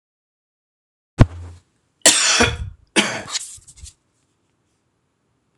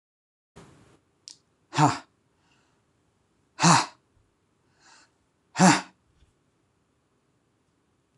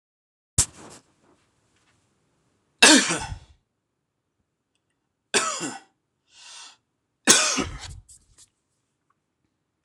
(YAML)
cough_length: 5.6 s
cough_amplitude: 26028
cough_signal_mean_std_ratio: 0.3
exhalation_length: 8.2 s
exhalation_amplitude: 20783
exhalation_signal_mean_std_ratio: 0.22
three_cough_length: 9.8 s
three_cough_amplitude: 26028
three_cough_signal_mean_std_ratio: 0.25
survey_phase: alpha (2021-03-01 to 2021-08-12)
age: 65+
gender: Male
wearing_mask: 'No'
symptom_none: true
smoker_status: Never smoked
respiratory_condition_asthma: false
respiratory_condition_other: false
recruitment_source: REACT
submission_delay: 3 days
covid_test_result: Negative
covid_test_method: RT-qPCR